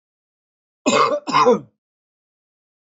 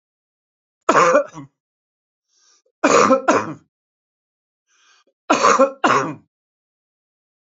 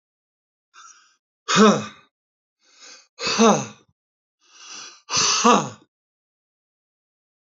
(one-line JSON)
{"cough_length": "3.0 s", "cough_amplitude": 21219, "cough_signal_mean_std_ratio": 0.37, "three_cough_length": "7.4 s", "three_cough_amplitude": 28474, "three_cough_signal_mean_std_ratio": 0.37, "exhalation_length": "7.4 s", "exhalation_amplitude": 29266, "exhalation_signal_mean_std_ratio": 0.32, "survey_phase": "beta (2021-08-13 to 2022-03-07)", "age": "65+", "gender": "Male", "wearing_mask": "No", "symptom_none": true, "smoker_status": "Never smoked", "respiratory_condition_asthma": false, "respiratory_condition_other": false, "recruitment_source": "REACT", "submission_delay": "2 days", "covid_test_result": "Negative", "covid_test_method": "RT-qPCR", "influenza_a_test_result": "Negative", "influenza_b_test_result": "Negative"}